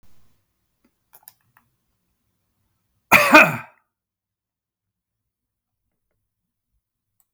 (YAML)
cough_length: 7.3 s
cough_amplitude: 32766
cough_signal_mean_std_ratio: 0.18
survey_phase: beta (2021-08-13 to 2022-03-07)
age: 65+
gender: Male
wearing_mask: 'No'
symptom_cough_any: true
symptom_runny_or_blocked_nose: true
smoker_status: Ex-smoker
respiratory_condition_asthma: false
respiratory_condition_other: false
recruitment_source: REACT
submission_delay: 1 day
covid_test_result: Negative
covid_test_method: RT-qPCR
influenza_a_test_result: Negative
influenza_b_test_result: Negative